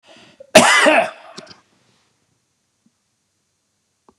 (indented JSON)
{
  "cough_length": "4.2 s",
  "cough_amplitude": 32768,
  "cough_signal_mean_std_ratio": 0.29,
  "survey_phase": "beta (2021-08-13 to 2022-03-07)",
  "age": "65+",
  "gender": "Male",
  "wearing_mask": "No",
  "symptom_none": true,
  "smoker_status": "Ex-smoker",
  "respiratory_condition_asthma": false,
  "respiratory_condition_other": false,
  "recruitment_source": "REACT",
  "submission_delay": "2 days",
  "covid_test_result": "Negative",
  "covid_test_method": "RT-qPCR"
}